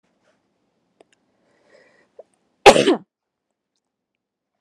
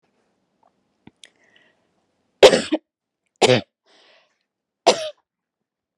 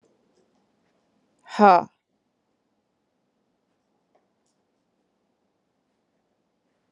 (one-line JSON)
{"cough_length": "4.6 s", "cough_amplitude": 32768, "cough_signal_mean_std_ratio": 0.17, "three_cough_length": "6.0 s", "three_cough_amplitude": 32768, "three_cough_signal_mean_std_ratio": 0.21, "exhalation_length": "6.9 s", "exhalation_amplitude": 28691, "exhalation_signal_mean_std_ratio": 0.14, "survey_phase": "alpha (2021-03-01 to 2021-08-12)", "age": "18-44", "gender": "Female", "wearing_mask": "No", "symptom_none": true, "smoker_status": "Never smoked", "respiratory_condition_asthma": false, "respiratory_condition_other": false, "recruitment_source": "REACT", "submission_delay": "0 days", "covid_test_result": "Negative", "covid_test_method": "RT-qPCR"}